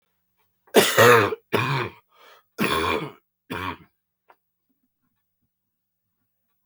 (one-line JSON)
{"three_cough_length": "6.7 s", "three_cough_amplitude": 31001, "three_cough_signal_mean_std_ratio": 0.34, "survey_phase": "beta (2021-08-13 to 2022-03-07)", "age": "65+", "gender": "Male", "wearing_mask": "No", "symptom_cough_any": true, "symptom_runny_or_blocked_nose": true, "symptom_sore_throat": true, "symptom_onset": "8 days", "smoker_status": "Never smoked", "respiratory_condition_asthma": false, "respiratory_condition_other": false, "recruitment_source": "REACT", "submission_delay": "1 day", "covid_test_result": "Positive", "covid_test_method": "RT-qPCR", "covid_ct_value": 19.8, "covid_ct_gene": "E gene", "influenza_a_test_result": "Negative", "influenza_b_test_result": "Negative"}